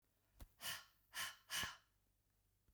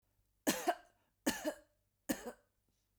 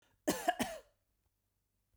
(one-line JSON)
{"exhalation_length": "2.7 s", "exhalation_amplitude": 830, "exhalation_signal_mean_std_ratio": 0.42, "three_cough_length": "3.0 s", "three_cough_amplitude": 3874, "three_cough_signal_mean_std_ratio": 0.33, "cough_length": "2.0 s", "cough_amplitude": 4717, "cough_signal_mean_std_ratio": 0.31, "survey_phase": "beta (2021-08-13 to 2022-03-07)", "age": "45-64", "gender": "Female", "wearing_mask": "No", "symptom_none": true, "smoker_status": "Never smoked", "respiratory_condition_asthma": false, "respiratory_condition_other": false, "recruitment_source": "REACT", "submission_delay": "1 day", "covid_test_result": "Negative", "covid_test_method": "RT-qPCR", "influenza_a_test_result": "Negative", "influenza_b_test_result": "Negative"}